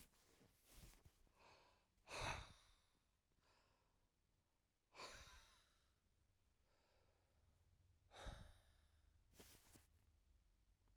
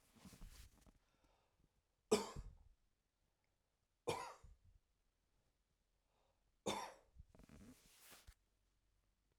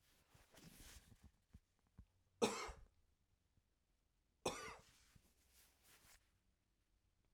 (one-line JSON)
{"exhalation_length": "11.0 s", "exhalation_amplitude": 565, "exhalation_signal_mean_std_ratio": 0.38, "three_cough_length": "9.4 s", "three_cough_amplitude": 2719, "three_cough_signal_mean_std_ratio": 0.25, "cough_length": "7.3 s", "cough_amplitude": 2399, "cough_signal_mean_std_ratio": 0.25, "survey_phase": "alpha (2021-03-01 to 2021-08-12)", "age": "45-64", "gender": "Male", "wearing_mask": "No", "symptom_none": true, "smoker_status": "Never smoked", "respiratory_condition_asthma": false, "respiratory_condition_other": false, "recruitment_source": "REACT", "submission_delay": "2 days", "covid_test_result": "Negative", "covid_test_method": "RT-qPCR"}